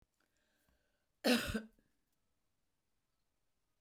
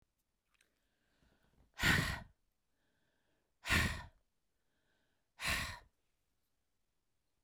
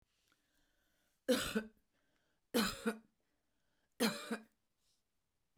cough_length: 3.8 s
cough_amplitude: 3509
cough_signal_mean_std_ratio: 0.23
exhalation_length: 7.4 s
exhalation_amplitude: 3558
exhalation_signal_mean_std_ratio: 0.29
three_cough_length: 5.6 s
three_cough_amplitude: 3254
three_cough_signal_mean_std_ratio: 0.32
survey_phase: beta (2021-08-13 to 2022-03-07)
age: 45-64
gender: Female
wearing_mask: 'No'
symptom_cough_any: true
symptom_new_continuous_cough: true
smoker_status: Ex-smoker
respiratory_condition_asthma: false
respiratory_condition_other: false
recruitment_source: Test and Trace
submission_delay: -1 day
covid_test_result: Negative
covid_test_method: LFT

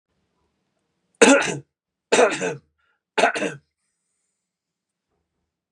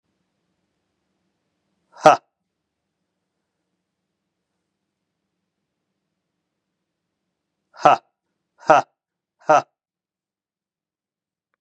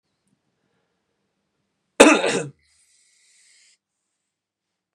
three_cough_length: 5.7 s
three_cough_amplitude: 32521
three_cough_signal_mean_std_ratio: 0.3
exhalation_length: 11.6 s
exhalation_amplitude: 32768
exhalation_signal_mean_std_ratio: 0.15
cough_length: 4.9 s
cough_amplitude: 32768
cough_signal_mean_std_ratio: 0.19
survey_phase: beta (2021-08-13 to 2022-03-07)
age: 18-44
gender: Male
wearing_mask: 'No'
symptom_none: true
smoker_status: Ex-smoker
respiratory_condition_asthma: false
respiratory_condition_other: false
recruitment_source: REACT
submission_delay: 4 days
covid_test_result: Negative
covid_test_method: RT-qPCR
influenza_a_test_result: Negative
influenza_b_test_result: Negative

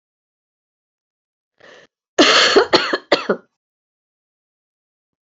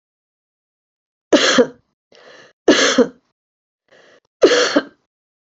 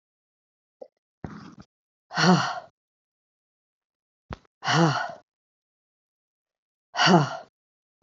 cough_length: 5.3 s
cough_amplitude: 32767
cough_signal_mean_std_ratio: 0.31
three_cough_length: 5.5 s
three_cough_amplitude: 31644
three_cough_signal_mean_std_ratio: 0.35
exhalation_length: 8.0 s
exhalation_amplitude: 21447
exhalation_signal_mean_std_ratio: 0.3
survey_phase: beta (2021-08-13 to 2022-03-07)
age: 45-64
gender: Female
wearing_mask: 'No'
symptom_sore_throat: true
symptom_onset: 7 days
smoker_status: Ex-smoker
respiratory_condition_asthma: false
respiratory_condition_other: false
recruitment_source: Test and Trace
submission_delay: 2 days
covid_test_result: Negative
covid_test_method: RT-qPCR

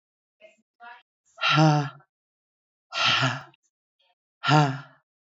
exhalation_length: 5.4 s
exhalation_amplitude: 19384
exhalation_signal_mean_std_ratio: 0.37
survey_phase: beta (2021-08-13 to 2022-03-07)
age: 65+
gender: Female
wearing_mask: 'No'
symptom_cough_any: true
symptom_change_to_sense_of_smell_or_taste: true
symptom_loss_of_taste: true
symptom_other: true
smoker_status: Current smoker (1 to 10 cigarettes per day)
respiratory_condition_asthma: true
respiratory_condition_other: false
recruitment_source: Test and Trace
submission_delay: 2 days
covid_test_result: Positive
covid_test_method: RT-qPCR
covid_ct_value: 25.6
covid_ct_gene: N gene
covid_ct_mean: 26.0
covid_viral_load: 3000 copies/ml
covid_viral_load_category: Minimal viral load (< 10K copies/ml)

